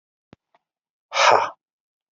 {
  "exhalation_length": "2.1 s",
  "exhalation_amplitude": 26320,
  "exhalation_signal_mean_std_ratio": 0.3,
  "survey_phase": "beta (2021-08-13 to 2022-03-07)",
  "age": "45-64",
  "gender": "Male",
  "wearing_mask": "No",
  "symptom_cough_any": true,
  "symptom_runny_or_blocked_nose": true,
  "symptom_sore_throat": true,
  "symptom_abdominal_pain": true,
  "symptom_fatigue": true,
  "symptom_fever_high_temperature": true,
  "symptom_headache": true,
  "smoker_status": "Never smoked",
  "respiratory_condition_asthma": false,
  "respiratory_condition_other": false,
  "recruitment_source": "Test and Trace",
  "submission_delay": "2 days",
  "covid_test_result": "Positive",
  "covid_test_method": "LFT"
}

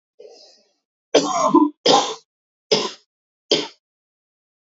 {
  "three_cough_length": "4.6 s",
  "three_cough_amplitude": 28412,
  "three_cough_signal_mean_std_ratio": 0.37,
  "survey_phase": "beta (2021-08-13 to 2022-03-07)",
  "age": "18-44",
  "gender": "Female",
  "wearing_mask": "No",
  "symptom_cough_any": true,
  "symptom_runny_or_blocked_nose": true,
  "symptom_shortness_of_breath": true,
  "symptom_sore_throat": true,
  "symptom_fatigue": true,
  "symptom_fever_high_temperature": true,
  "symptom_headache": true,
  "smoker_status": "Never smoked",
  "respiratory_condition_asthma": false,
  "respiratory_condition_other": false,
  "recruitment_source": "Test and Trace",
  "submission_delay": "2 days",
  "covid_test_result": "Positive",
  "covid_test_method": "LFT"
}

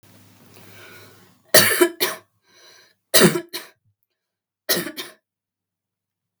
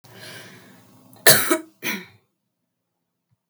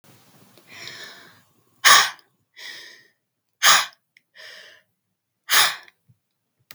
{
  "three_cough_length": "6.4 s",
  "three_cough_amplitude": 32768,
  "three_cough_signal_mean_std_ratio": 0.29,
  "cough_length": "3.5 s",
  "cough_amplitude": 32768,
  "cough_signal_mean_std_ratio": 0.26,
  "exhalation_length": "6.7 s",
  "exhalation_amplitude": 32768,
  "exhalation_signal_mean_std_ratio": 0.27,
  "survey_phase": "beta (2021-08-13 to 2022-03-07)",
  "age": "18-44",
  "gender": "Female",
  "wearing_mask": "No",
  "symptom_none": true,
  "smoker_status": "Never smoked",
  "respiratory_condition_asthma": false,
  "respiratory_condition_other": false,
  "recruitment_source": "Test and Trace",
  "submission_delay": "1 day",
  "covid_test_result": "Positive",
  "covid_test_method": "ePCR"
}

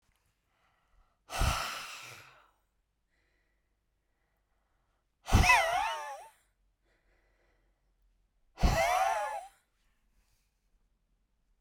{
  "exhalation_length": "11.6 s",
  "exhalation_amplitude": 9393,
  "exhalation_signal_mean_std_ratio": 0.32,
  "survey_phase": "beta (2021-08-13 to 2022-03-07)",
  "age": "45-64",
  "gender": "Female",
  "wearing_mask": "No",
  "symptom_none": true,
  "smoker_status": "Never smoked",
  "respiratory_condition_asthma": true,
  "respiratory_condition_other": false,
  "recruitment_source": "REACT",
  "submission_delay": "2 days",
  "covid_test_result": "Negative",
  "covid_test_method": "RT-qPCR"
}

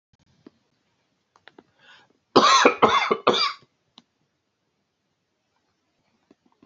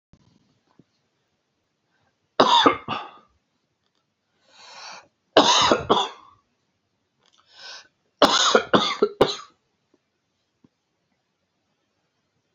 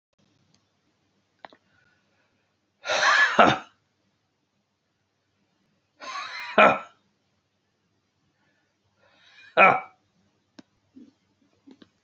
{
  "cough_length": "6.7 s",
  "cough_amplitude": 28546,
  "cough_signal_mean_std_ratio": 0.29,
  "three_cough_length": "12.5 s",
  "three_cough_amplitude": 32768,
  "three_cough_signal_mean_std_ratio": 0.3,
  "exhalation_length": "12.0 s",
  "exhalation_amplitude": 27734,
  "exhalation_signal_mean_std_ratio": 0.24,
  "survey_phase": "beta (2021-08-13 to 2022-03-07)",
  "age": "45-64",
  "gender": "Male",
  "wearing_mask": "No",
  "symptom_cough_any": true,
  "symptom_runny_or_blocked_nose": true,
  "symptom_sore_throat": true,
  "symptom_onset": "7 days",
  "smoker_status": "Never smoked",
  "respiratory_condition_asthma": false,
  "respiratory_condition_other": false,
  "recruitment_source": "REACT",
  "submission_delay": "1 day",
  "covid_test_result": "Negative",
  "covid_test_method": "RT-qPCR",
  "influenza_a_test_result": "Negative",
  "influenza_b_test_result": "Negative"
}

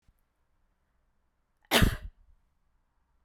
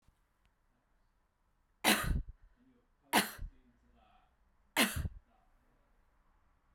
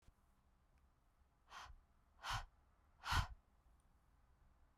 {
  "cough_length": "3.2 s",
  "cough_amplitude": 10925,
  "cough_signal_mean_std_ratio": 0.22,
  "three_cough_length": "6.7 s",
  "three_cough_amplitude": 8794,
  "three_cough_signal_mean_std_ratio": 0.28,
  "exhalation_length": "4.8 s",
  "exhalation_amplitude": 1507,
  "exhalation_signal_mean_std_ratio": 0.3,
  "survey_phase": "beta (2021-08-13 to 2022-03-07)",
  "age": "18-44",
  "gender": "Female",
  "wearing_mask": "No",
  "symptom_runny_or_blocked_nose": true,
  "symptom_fatigue": true,
  "symptom_headache": true,
  "smoker_status": "Never smoked",
  "respiratory_condition_asthma": false,
  "respiratory_condition_other": false,
  "recruitment_source": "Test and Trace",
  "submission_delay": "7 days",
  "covid_test_result": "Negative",
  "covid_test_method": "RT-qPCR"
}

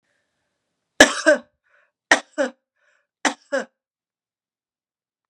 {
  "three_cough_length": "5.3 s",
  "three_cough_amplitude": 32768,
  "three_cough_signal_mean_std_ratio": 0.23,
  "survey_phase": "beta (2021-08-13 to 2022-03-07)",
  "age": "45-64",
  "gender": "Female",
  "wearing_mask": "No",
  "symptom_none": true,
  "smoker_status": "Never smoked",
  "respiratory_condition_asthma": false,
  "respiratory_condition_other": false,
  "recruitment_source": "REACT",
  "submission_delay": "1 day",
  "covid_test_result": "Negative",
  "covid_test_method": "RT-qPCR",
  "influenza_a_test_result": "Negative",
  "influenza_b_test_result": "Negative"
}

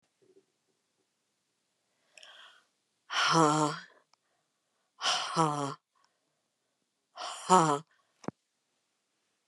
{
  "exhalation_length": "9.5 s",
  "exhalation_amplitude": 13293,
  "exhalation_signal_mean_std_ratio": 0.3,
  "survey_phase": "beta (2021-08-13 to 2022-03-07)",
  "age": "45-64",
  "gender": "Female",
  "wearing_mask": "No",
  "symptom_cough_any": true,
  "symptom_new_continuous_cough": true,
  "symptom_runny_or_blocked_nose": true,
  "symptom_sore_throat": true,
  "symptom_fatigue": true,
  "symptom_headache": true,
  "symptom_onset": "7 days",
  "smoker_status": "Ex-smoker",
  "respiratory_condition_asthma": false,
  "respiratory_condition_other": false,
  "recruitment_source": "Test and Trace",
  "submission_delay": "2 days",
  "covid_test_result": "Positive",
  "covid_test_method": "ePCR"
}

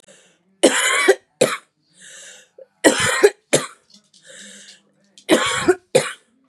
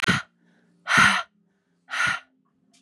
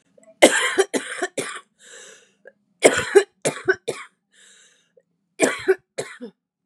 {
  "three_cough_length": "6.5 s",
  "three_cough_amplitude": 32767,
  "three_cough_signal_mean_std_ratio": 0.4,
  "exhalation_length": "2.8 s",
  "exhalation_amplitude": 21882,
  "exhalation_signal_mean_std_ratio": 0.41,
  "cough_length": "6.7 s",
  "cough_amplitude": 32768,
  "cough_signal_mean_std_ratio": 0.34,
  "survey_phase": "beta (2021-08-13 to 2022-03-07)",
  "age": "18-44",
  "gender": "Female",
  "wearing_mask": "No",
  "symptom_cough_any": true,
  "symptom_runny_or_blocked_nose": true,
  "symptom_sore_throat": true,
  "symptom_fatigue": true,
  "symptom_change_to_sense_of_smell_or_taste": true,
  "symptom_loss_of_taste": true,
  "symptom_other": true,
  "symptom_onset": "9 days",
  "smoker_status": "Current smoker (11 or more cigarettes per day)",
  "respiratory_condition_asthma": false,
  "respiratory_condition_other": false,
  "recruitment_source": "Test and Trace",
  "submission_delay": "1 day",
  "covid_test_result": "Positive",
  "covid_test_method": "RT-qPCR",
  "covid_ct_value": 18.0,
  "covid_ct_gene": "ORF1ab gene",
  "covid_ct_mean": 18.3,
  "covid_viral_load": "1000000 copies/ml",
  "covid_viral_load_category": "High viral load (>1M copies/ml)"
}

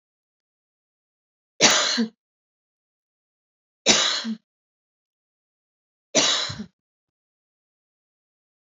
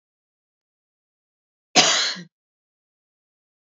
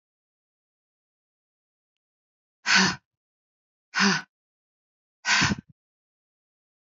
{
  "three_cough_length": "8.6 s",
  "three_cough_amplitude": 30612,
  "three_cough_signal_mean_std_ratio": 0.29,
  "cough_length": "3.7 s",
  "cough_amplitude": 29262,
  "cough_signal_mean_std_ratio": 0.24,
  "exhalation_length": "6.8 s",
  "exhalation_amplitude": 13891,
  "exhalation_signal_mean_std_ratio": 0.27,
  "survey_phase": "beta (2021-08-13 to 2022-03-07)",
  "age": "45-64",
  "gender": "Female",
  "wearing_mask": "No",
  "symptom_none": true,
  "smoker_status": "Never smoked",
  "respiratory_condition_asthma": false,
  "respiratory_condition_other": false,
  "recruitment_source": "REACT",
  "submission_delay": "2 days",
  "covid_test_result": "Negative",
  "covid_test_method": "RT-qPCR",
  "influenza_a_test_result": "Negative",
  "influenza_b_test_result": "Negative"
}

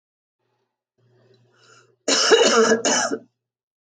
{
  "cough_length": "3.9 s",
  "cough_amplitude": 29292,
  "cough_signal_mean_std_ratio": 0.42,
  "survey_phase": "alpha (2021-03-01 to 2021-08-12)",
  "age": "45-64",
  "gender": "Female",
  "wearing_mask": "No",
  "symptom_none": true,
  "smoker_status": "Ex-smoker",
  "respiratory_condition_asthma": false,
  "respiratory_condition_other": false,
  "recruitment_source": "REACT",
  "submission_delay": "1 day",
  "covid_test_result": "Negative",
  "covid_test_method": "RT-qPCR"
}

